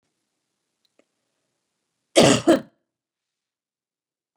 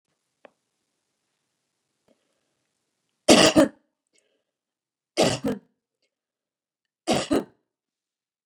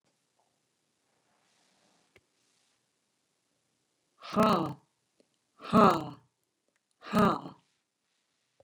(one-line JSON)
{"cough_length": "4.4 s", "cough_amplitude": 29211, "cough_signal_mean_std_ratio": 0.22, "three_cough_length": "8.5 s", "three_cough_amplitude": 30669, "three_cough_signal_mean_std_ratio": 0.23, "exhalation_length": "8.6 s", "exhalation_amplitude": 14167, "exhalation_signal_mean_std_ratio": 0.25, "survey_phase": "beta (2021-08-13 to 2022-03-07)", "age": "45-64", "gender": "Female", "wearing_mask": "No", "symptom_none": true, "smoker_status": "Never smoked", "respiratory_condition_asthma": false, "respiratory_condition_other": false, "recruitment_source": "REACT", "submission_delay": "1 day", "covid_test_result": "Negative", "covid_test_method": "RT-qPCR", "influenza_a_test_result": "Unknown/Void", "influenza_b_test_result": "Unknown/Void"}